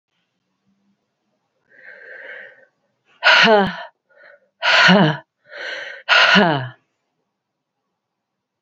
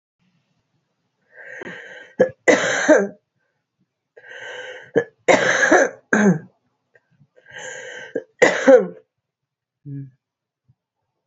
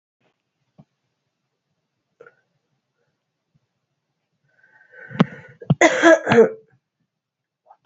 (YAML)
exhalation_length: 8.6 s
exhalation_amplitude: 30841
exhalation_signal_mean_std_ratio: 0.37
three_cough_length: 11.3 s
three_cough_amplitude: 28947
three_cough_signal_mean_std_ratio: 0.36
cough_length: 7.9 s
cough_amplitude: 29046
cough_signal_mean_std_ratio: 0.23
survey_phase: beta (2021-08-13 to 2022-03-07)
age: 45-64
gender: Female
wearing_mask: 'No'
symptom_cough_any: true
symptom_runny_or_blocked_nose: true
symptom_sore_throat: true
symptom_abdominal_pain: true
symptom_fatigue: true
symptom_headache: true
symptom_change_to_sense_of_smell_or_taste: true
symptom_onset: 3 days
smoker_status: Ex-smoker
respiratory_condition_asthma: false
respiratory_condition_other: false
recruitment_source: Test and Trace
submission_delay: 1 day
covid_test_result: Positive
covid_test_method: RT-qPCR
covid_ct_value: 19.1
covid_ct_gene: ORF1ab gene
covid_ct_mean: 19.5
covid_viral_load: 400000 copies/ml
covid_viral_load_category: Low viral load (10K-1M copies/ml)